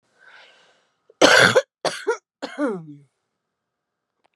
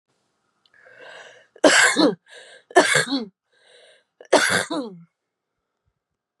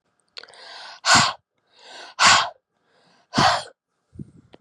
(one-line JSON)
{"cough_length": "4.4 s", "cough_amplitude": 32767, "cough_signal_mean_std_ratio": 0.32, "three_cough_length": "6.4 s", "three_cough_amplitude": 32219, "three_cough_signal_mean_std_ratio": 0.36, "exhalation_length": "4.6 s", "exhalation_amplitude": 26860, "exhalation_signal_mean_std_ratio": 0.35, "survey_phase": "beta (2021-08-13 to 2022-03-07)", "age": "18-44", "gender": "Female", "wearing_mask": "No", "symptom_cough_any": true, "symptom_fatigue": true, "smoker_status": "Current smoker (1 to 10 cigarettes per day)", "respiratory_condition_asthma": false, "respiratory_condition_other": false, "recruitment_source": "REACT", "submission_delay": "0 days", "covid_test_result": "Negative", "covid_test_method": "RT-qPCR", "influenza_a_test_result": "Negative", "influenza_b_test_result": "Negative"}